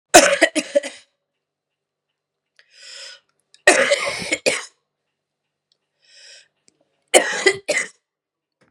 {"three_cough_length": "8.7 s", "three_cough_amplitude": 32768, "three_cough_signal_mean_std_ratio": 0.31, "survey_phase": "beta (2021-08-13 to 2022-03-07)", "age": "45-64", "gender": "Female", "wearing_mask": "No", "symptom_cough_any": true, "symptom_runny_or_blocked_nose": true, "symptom_fatigue": true, "symptom_headache": true, "symptom_change_to_sense_of_smell_or_taste": true, "symptom_onset": "3 days", "smoker_status": "Never smoked", "respiratory_condition_asthma": false, "respiratory_condition_other": false, "recruitment_source": "Test and Trace", "submission_delay": "2 days", "covid_test_result": "Positive", "covid_test_method": "RT-qPCR", "covid_ct_value": 25.4, "covid_ct_gene": "ORF1ab gene"}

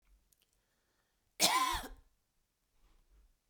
{"cough_length": "3.5 s", "cough_amplitude": 7749, "cough_signal_mean_std_ratio": 0.29, "survey_phase": "beta (2021-08-13 to 2022-03-07)", "age": "18-44", "gender": "Female", "wearing_mask": "No", "symptom_none": true, "smoker_status": "Never smoked", "respiratory_condition_asthma": false, "respiratory_condition_other": false, "recruitment_source": "REACT", "submission_delay": "1 day", "covid_test_result": "Negative", "covid_test_method": "RT-qPCR"}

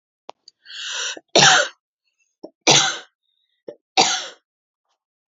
{"three_cough_length": "5.3 s", "three_cough_amplitude": 32767, "three_cough_signal_mean_std_ratio": 0.34, "survey_phase": "beta (2021-08-13 to 2022-03-07)", "age": "18-44", "gender": "Female", "wearing_mask": "No", "symptom_none": true, "symptom_onset": "12 days", "smoker_status": "Never smoked", "respiratory_condition_asthma": true, "respiratory_condition_other": false, "recruitment_source": "REACT", "submission_delay": "2 days", "covid_test_result": "Negative", "covid_test_method": "RT-qPCR", "influenza_a_test_result": "Negative", "influenza_b_test_result": "Negative"}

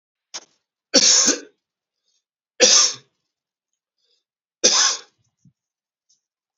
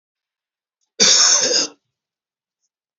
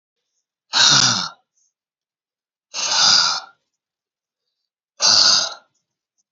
{"three_cough_length": "6.6 s", "three_cough_amplitude": 29340, "three_cough_signal_mean_std_ratio": 0.32, "cough_length": "3.0 s", "cough_amplitude": 32767, "cough_signal_mean_std_ratio": 0.39, "exhalation_length": "6.3 s", "exhalation_amplitude": 31660, "exhalation_signal_mean_std_ratio": 0.41, "survey_phase": "beta (2021-08-13 to 2022-03-07)", "age": "45-64", "gender": "Male", "wearing_mask": "No", "symptom_cough_any": true, "symptom_new_continuous_cough": true, "symptom_runny_or_blocked_nose": true, "symptom_sore_throat": true, "symptom_fatigue": true, "smoker_status": "Never smoked", "respiratory_condition_asthma": false, "respiratory_condition_other": false, "recruitment_source": "Test and Trace", "submission_delay": "2 days", "covid_test_result": "Positive", "covid_test_method": "RT-qPCR", "covid_ct_value": 22.8, "covid_ct_gene": "ORF1ab gene", "covid_ct_mean": 23.4, "covid_viral_load": "20000 copies/ml", "covid_viral_load_category": "Low viral load (10K-1M copies/ml)"}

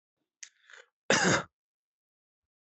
{"cough_length": "2.6 s", "cough_amplitude": 9907, "cough_signal_mean_std_ratio": 0.28, "survey_phase": "alpha (2021-03-01 to 2021-08-12)", "age": "45-64", "gender": "Male", "wearing_mask": "No", "symptom_none": true, "smoker_status": "Ex-smoker", "respiratory_condition_asthma": false, "respiratory_condition_other": false, "recruitment_source": "REACT", "submission_delay": "2 days", "covid_test_result": "Negative", "covid_test_method": "RT-qPCR"}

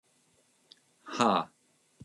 {"exhalation_length": "2.0 s", "exhalation_amplitude": 9786, "exhalation_signal_mean_std_ratio": 0.3, "survey_phase": "beta (2021-08-13 to 2022-03-07)", "age": "45-64", "gender": "Male", "wearing_mask": "No", "symptom_none": true, "smoker_status": "Never smoked", "respiratory_condition_asthma": false, "respiratory_condition_other": false, "recruitment_source": "REACT", "submission_delay": "4 days", "covid_test_result": "Negative", "covid_test_method": "RT-qPCR", "influenza_a_test_result": "Negative", "influenza_b_test_result": "Negative"}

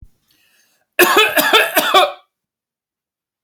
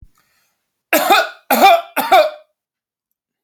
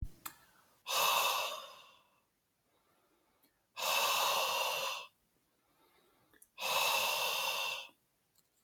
{"cough_length": "3.4 s", "cough_amplitude": 32768, "cough_signal_mean_std_ratio": 0.44, "three_cough_length": "3.4 s", "three_cough_amplitude": 32768, "three_cough_signal_mean_std_ratio": 0.43, "exhalation_length": "8.6 s", "exhalation_amplitude": 4435, "exhalation_signal_mean_std_ratio": 0.55, "survey_phase": "alpha (2021-03-01 to 2021-08-12)", "age": "18-44", "gender": "Male", "wearing_mask": "No", "symptom_none": true, "smoker_status": "Never smoked", "respiratory_condition_asthma": true, "respiratory_condition_other": false, "recruitment_source": "REACT", "submission_delay": "2 days", "covid_test_result": "Negative", "covid_test_method": "RT-qPCR"}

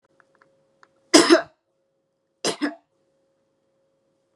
{"cough_length": "4.4 s", "cough_amplitude": 32043, "cough_signal_mean_std_ratio": 0.22, "survey_phase": "beta (2021-08-13 to 2022-03-07)", "age": "45-64", "gender": "Female", "wearing_mask": "No", "symptom_none": true, "smoker_status": "Never smoked", "respiratory_condition_asthma": false, "respiratory_condition_other": false, "recruitment_source": "REACT", "submission_delay": "1 day", "covid_test_result": "Negative", "covid_test_method": "RT-qPCR", "influenza_a_test_result": "Negative", "influenza_b_test_result": "Negative"}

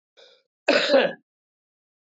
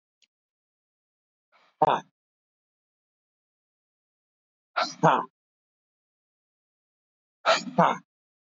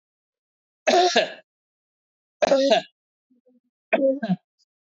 {"cough_length": "2.1 s", "cough_amplitude": 15383, "cough_signal_mean_std_ratio": 0.36, "exhalation_length": "8.4 s", "exhalation_amplitude": 14776, "exhalation_signal_mean_std_ratio": 0.23, "three_cough_length": "4.9 s", "three_cough_amplitude": 17647, "three_cough_signal_mean_std_ratio": 0.4, "survey_phase": "beta (2021-08-13 to 2022-03-07)", "age": "65+", "gender": "Male", "wearing_mask": "No", "symptom_fatigue": true, "symptom_headache": true, "smoker_status": "Never smoked", "recruitment_source": "Test and Trace", "submission_delay": "2 days", "covid_test_result": "Positive", "covid_test_method": "RT-qPCR", "covid_ct_value": 20.2, "covid_ct_gene": "ORF1ab gene", "covid_ct_mean": 20.6, "covid_viral_load": "170000 copies/ml", "covid_viral_load_category": "Low viral load (10K-1M copies/ml)"}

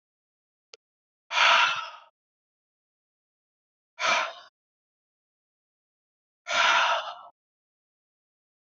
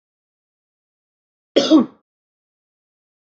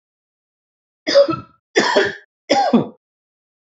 {"exhalation_length": "8.8 s", "exhalation_amplitude": 15357, "exhalation_signal_mean_std_ratio": 0.31, "cough_length": "3.3 s", "cough_amplitude": 26591, "cough_signal_mean_std_ratio": 0.22, "three_cough_length": "3.8 s", "three_cough_amplitude": 27356, "three_cough_signal_mean_std_ratio": 0.41, "survey_phase": "beta (2021-08-13 to 2022-03-07)", "age": "45-64", "gender": "Male", "wearing_mask": "No", "symptom_none": true, "smoker_status": "Never smoked", "respiratory_condition_asthma": false, "respiratory_condition_other": false, "recruitment_source": "REACT", "submission_delay": "1 day", "covid_test_result": "Negative", "covid_test_method": "RT-qPCR", "influenza_a_test_result": "Negative", "influenza_b_test_result": "Negative"}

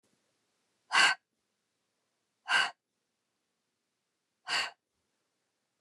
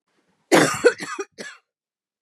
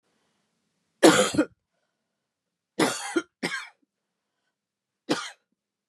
{"exhalation_length": "5.8 s", "exhalation_amplitude": 8503, "exhalation_signal_mean_std_ratio": 0.25, "cough_length": "2.2 s", "cough_amplitude": 30349, "cough_signal_mean_std_ratio": 0.34, "three_cough_length": "5.9 s", "three_cough_amplitude": 24999, "three_cough_signal_mean_std_ratio": 0.27, "survey_phase": "beta (2021-08-13 to 2022-03-07)", "age": "45-64", "gender": "Female", "wearing_mask": "No", "symptom_cough_any": true, "symptom_runny_or_blocked_nose": true, "symptom_shortness_of_breath": true, "symptom_sore_throat": true, "symptom_headache": true, "symptom_other": true, "symptom_onset": "2 days", "smoker_status": "Never smoked", "respiratory_condition_asthma": false, "respiratory_condition_other": false, "recruitment_source": "Test and Trace", "submission_delay": "1 day", "covid_test_result": "Positive", "covid_test_method": "RT-qPCR", "covid_ct_value": 22.2, "covid_ct_gene": "N gene"}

